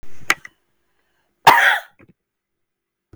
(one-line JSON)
{"cough_length": "3.2 s", "cough_amplitude": 32768, "cough_signal_mean_std_ratio": 0.31, "survey_phase": "beta (2021-08-13 to 2022-03-07)", "age": "65+", "gender": "Female", "wearing_mask": "No", "symptom_none": true, "smoker_status": "Never smoked", "respiratory_condition_asthma": true, "respiratory_condition_other": false, "recruitment_source": "REACT", "submission_delay": "6 days", "covid_test_result": "Negative", "covid_test_method": "RT-qPCR"}